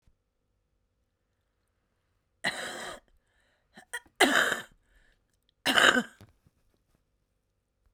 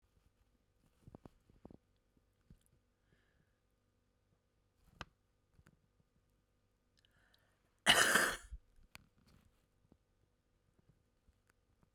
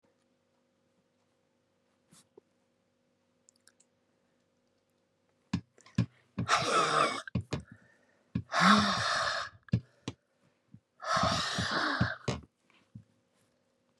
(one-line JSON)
{"three_cough_length": "7.9 s", "three_cough_amplitude": 18779, "three_cough_signal_mean_std_ratio": 0.26, "cough_length": "11.9 s", "cough_amplitude": 6532, "cough_signal_mean_std_ratio": 0.18, "exhalation_length": "14.0 s", "exhalation_amplitude": 10687, "exhalation_signal_mean_std_ratio": 0.38, "survey_phase": "beta (2021-08-13 to 2022-03-07)", "age": "65+", "gender": "Female", "wearing_mask": "No", "symptom_cough_any": true, "symptom_shortness_of_breath": true, "smoker_status": "Ex-smoker", "respiratory_condition_asthma": false, "respiratory_condition_other": true, "recruitment_source": "REACT", "submission_delay": "1 day", "covid_test_result": "Negative", "covid_test_method": "RT-qPCR"}